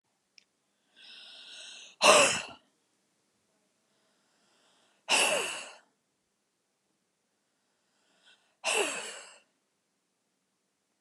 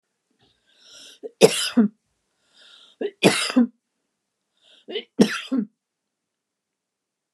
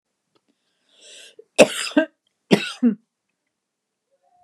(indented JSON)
{
  "exhalation_length": "11.0 s",
  "exhalation_amplitude": 19191,
  "exhalation_signal_mean_std_ratio": 0.26,
  "three_cough_length": "7.3 s",
  "three_cough_amplitude": 29204,
  "three_cough_signal_mean_std_ratio": 0.29,
  "cough_length": "4.4 s",
  "cough_amplitude": 29204,
  "cough_signal_mean_std_ratio": 0.24,
  "survey_phase": "beta (2021-08-13 to 2022-03-07)",
  "age": "45-64",
  "gender": "Female",
  "wearing_mask": "No",
  "symptom_none": true,
  "smoker_status": "Never smoked",
  "respiratory_condition_asthma": true,
  "respiratory_condition_other": false,
  "recruitment_source": "REACT",
  "submission_delay": "2 days",
  "covid_test_result": "Negative",
  "covid_test_method": "RT-qPCR"
}